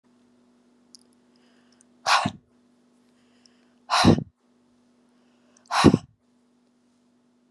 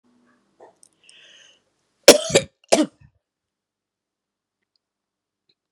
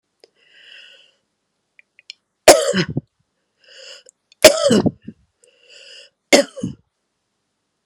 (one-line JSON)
{"exhalation_length": "7.5 s", "exhalation_amplitude": 26905, "exhalation_signal_mean_std_ratio": 0.24, "cough_length": "5.7 s", "cough_amplitude": 32768, "cough_signal_mean_std_ratio": 0.17, "three_cough_length": "7.9 s", "three_cough_amplitude": 32768, "three_cough_signal_mean_std_ratio": 0.25, "survey_phase": "beta (2021-08-13 to 2022-03-07)", "age": "65+", "gender": "Female", "wearing_mask": "No", "symptom_cough_any": true, "symptom_runny_or_blocked_nose": true, "smoker_status": "Ex-smoker", "respiratory_condition_asthma": false, "respiratory_condition_other": false, "recruitment_source": "REACT", "submission_delay": "1 day", "covid_test_result": "Negative", "covid_test_method": "RT-qPCR", "influenza_a_test_result": "Negative", "influenza_b_test_result": "Negative"}